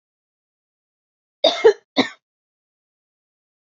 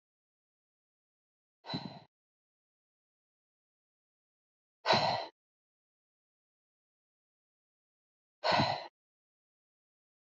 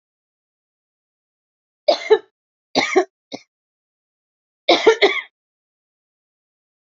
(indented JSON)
{
  "cough_length": "3.8 s",
  "cough_amplitude": 26380,
  "cough_signal_mean_std_ratio": 0.21,
  "exhalation_length": "10.3 s",
  "exhalation_amplitude": 7337,
  "exhalation_signal_mean_std_ratio": 0.22,
  "three_cough_length": "6.9 s",
  "three_cough_amplitude": 31689,
  "three_cough_signal_mean_std_ratio": 0.26,
  "survey_phase": "beta (2021-08-13 to 2022-03-07)",
  "age": "45-64",
  "gender": "Female",
  "wearing_mask": "No",
  "symptom_cough_any": true,
  "symptom_runny_or_blocked_nose": true,
  "symptom_sore_throat": true,
  "symptom_headache": true,
  "symptom_change_to_sense_of_smell_or_taste": true,
  "symptom_loss_of_taste": true,
  "smoker_status": "Current smoker (11 or more cigarettes per day)",
  "respiratory_condition_asthma": true,
  "respiratory_condition_other": false,
  "recruitment_source": "Test and Trace",
  "submission_delay": "1 day",
  "covid_test_result": "Positive",
  "covid_test_method": "RT-qPCR",
  "covid_ct_value": 16.8,
  "covid_ct_gene": "ORF1ab gene",
  "covid_ct_mean": 17.5,
  "covid_viral_load": "1900000 copies/ml",
  "covid_viral_load_category": "High viral load (>1M copies/ml)"
}